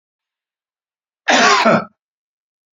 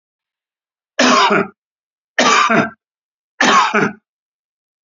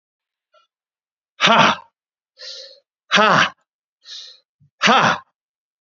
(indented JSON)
{
  "cough_length": "2.7 s",
  "cough_amplitude": 31405,
  "cough_signal_mean_std_ratio": 0.37,
  "three_cough_length": "4.9 s",
  "three_cough_amplitude": 32768,
  "three_cough_signal_mean_std_ratio": 0.46,
  "exhalation_length": "5.8 s",
  "exhalation_amplitude": 29483,
  "exhalation_signal_mean_std_ratio": 0.35,
  "survey_phase": "beta (2021-08-13 to 2022-03-07)",
  "age": "45-64",
  "gender": "Male",
  "wearing_mask": "Yes",
  "symptom_cough_any": true,
  "symptom_sore_throat": true,
  "symptom_fatigue": true,
  "symptom_headache": true,
  "smoker_status": "Never smoked",
  "respiratory_condition_asthma": false,
  "respiratory_condition_other": false,
  "recruitment_source": "Test and Trace",
  "submission_delay": "1 day",
  "covid_test_result": "Positive",
  "covid_test_method": "LFT"
}